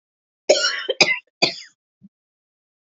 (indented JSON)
{
  "cough_length": "2.8 s",
  "cough_amplitude": 29783,
  "cough_signal_mean_std_ratio": 0.34,
  "survey_phase": "beta (2021-08-13 to 2022-03-07)",
  "age": "18-44",
  "gender": "Female",
  "wearing_mask": "No",
  "symptom_cough_any": true,
  "symptom_runny_or_blocked_nose": true,
  "symptom_sore_throat": true,
  "symptom_headache": true,
  "symptom_change_to_sense_of_smell_or_taste": true,
  "symptom_other": true,
  "symptom_onset": "4 days",
  "smoker_status": "Never smoked",
  "respiratory_condition_asthma": false,
  "respiratory_condition_other": false,
  "recruitment_source": "Test and Trace",
  "submission_delay": "2 days",
  "covid_test_result": "Positive",
  "covid_test_method": "RT-qPCR",
  "covid_ct_value": 19.9,
  "covid_ct_gene": "ORF1ab gene",
  "covid_ct_mean": 20.3,
  "covid_viral_load": "220000 copies/ml",
  "covid_viral_load_category": "Low viral load (10K-1M copies/ml)"
}